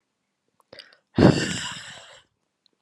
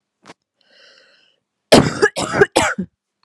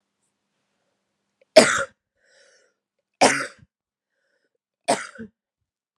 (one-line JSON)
{"exhalation_length": "2.8 s", "exhalation_amplitude": 27824, "exhalation_signal_mean_std_ratio": 0.28, "cough_length": "3.2 s", "cough_amplitude": 32768, "cough_signal_mean_std_ratio": 0.35, "three_cough_length": "6.0 s", "three_cough_amplitude": 32768, "three_cough_signal_mean_std_ratio": 0.21, "survey_phase": "beta (2021-08-13 to 2022-03-07)", "age": "18-44", "gender": "Female", "wearing_mask": "No", "symptom_runny_or_blocked_nose": true, "symptom_sore_throat": true, "symptom_fatigue": true, "symptom_headache": true, "symptom_other": true, "symptom_onset": "3 days", "smoker_status": "Prefer not to say", "respiratory_condition_asthma": true, "respiratory_condition_other": false, "recruitment_source": "Test and Trace", "submission_delay": "1 day", "covid_test_result": "Positive", "covid_test_method": "RT-qPCR", "covid_ct_value": 14.7, "covid_ct_gene": "ORF1ab gene"}